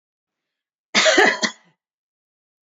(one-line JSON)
{"cough_length": "2.6 s", "cough_amplitude": 27998, "cough_signal_mean_std_ratio": 0.34, "survey_phase": "beta (2021-08-13 to 2022-03-07)", "age": "45-64", "gender": "Female", "wearing_mask": "No", "symptom_runny_or_blocked_nose": true, "smoker_status": "Ex-smoker", "respiratory_condition_asthma": false, "respiratory_condition_other": false, "recruitment_source": "REACT", "submission_delay": "1 day", "covid_test_result": "Negative", "covid_test_method": "RT-qPCR"}